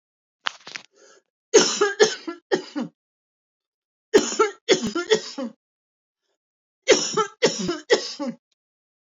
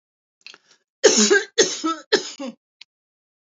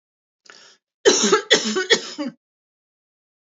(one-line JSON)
{"three_cough_length": "9.0 s", "three_cough_amplitude": 27578, "three_cough_signal_mean_std_ratio": 0.38, "exhalation_length": "3.5 s", "exhalation_amplitude": 30084, "exhalation_signal_mean_std_ratio": 0.37, "cough_length": "3.5 s", "cough_amplitude": 28717, "cough_signal_mean_std_ratio": 0.38, "survey_phase": "beta (2021-08-13 to 2022-03-07)", "age": "45-64", "gender": "Female", "wearing_mask": "No", "symptom_cough_any": true, "symptom_headache": true, "smoker_status": "Never smoked", "respiratory_condition_asthma": true, "respiratory_condition_other": false, "recruitment_source": "REACT", "submission_delay": "1 day", "covid_test_result": "Negative", "covid_test_method": "RT-qPCR", "influenza_a_test_result": "Unknown/Void", "influenza_b_test_result": "Unknown/Void"}